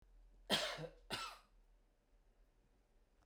{"cough_length": "3.3 s", "cough_amplitude": 2374, "cough_signal_mean_std_ratio": 0.37, "survey_phase": "beta (2021-08-13 to 2022-03-07)", "age": "65+", "gender": "Male", "wearing_mask": "No", "symptom_none": true, "smoker_status": "Never smoked", "respiratory_condition_asthma": false, "respiratory_condition_other": false, "recruitment_source": "REACT", "submission_delay": "1 day", "covid_test_result": "Negative", "covid_test_method": "RT-qPCR"}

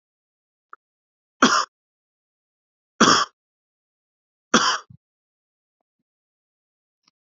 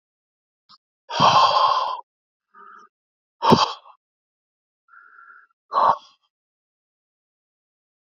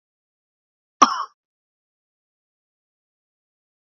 {"three_cough_length": "7.3 s", "three_cough_amplitude": 31823, "three_cough_signal_mean_std_ratio": 0.23, "exhalation_length": "8.2 s", "exhalation_amplitude": 27452, "exhalation_signal_mean_std_ratio": 0.32, "cough_length": "3.8 s", "cough_amplitude": 29784, "cough_signal_mean_std_ratio": 0.13, "survey_phase": "beta (2021-08-13 to 2022-03-07)", "age": "45-64", "gender": "Male", "wearing_mask": "No", "symptom_cough_any": true, "symptom_sore_throat": true, "symptom_fatigue": true, "symptom_fever_high_temperature": true, "symptom_onset": "4 days", "smoker_status": "Never smoked", "respiratory_condition_asthma": false, "respiratory_condition_other": false, "recruitment_source": "Test and Trace", "submission_delay": "2 days", "covid_test_result": "Positive", "covid_test_method": "ePCR"}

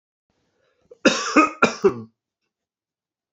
{"cough_length": "3.3 s", "cough_amplitude": 27850, "cough_signal_mean_std_ratio": 0.31, "survey_phase": "beta (2021-08-13 to 2022-03-07)", "age": "45-64", "gender": "Male", "wearing_mask": "No", "symptom_none": true, "smoker_status": "Never smoked", "respiratory_condition_asthma": false, "respiratory_condition_other": false, "recruitment_source": "REACT", "submission_delay": "1 day", "covid_test_result": "Negative", "covid_test_method": "RT-qPCR", "influenza_a_test_result": "Negative", "influenza_b_test_result": "Negative"}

